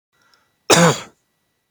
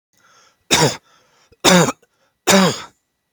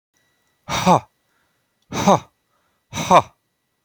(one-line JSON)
{"cough_length": "1.7 s", "cough_amplitude": 32768, "cough_signal_mean_std_ratio": 0.32, "three_cough_length": "3.3 s", "three_cough_amplitude": 32308, "three_cough_signal_mean_std_ratio": 0.4, "exhalation_length": "3.8 s", "exhalation_amplitude": 29998, "exhalation_signal_mean_std_ratio": 0.31, "survey_phase": "beta (2021-08-13 to 2022-03-07)", "age": "18-44", "gender": "Male", "wearing_mask": "No", "symptom_none": true, "smoker_status": "Never smoked", "respiratory_condition_asthma": false, "respiratory_condition_other": false, "recruitment_source": "REACT", "submission_delay": "2 days", "covid_test_result": "Negative", "covid_test_method": "RT-qPCR", "influenza_a_test_result": "Unknown/Void", "influenza_b_test_result": "Unknown/Void"}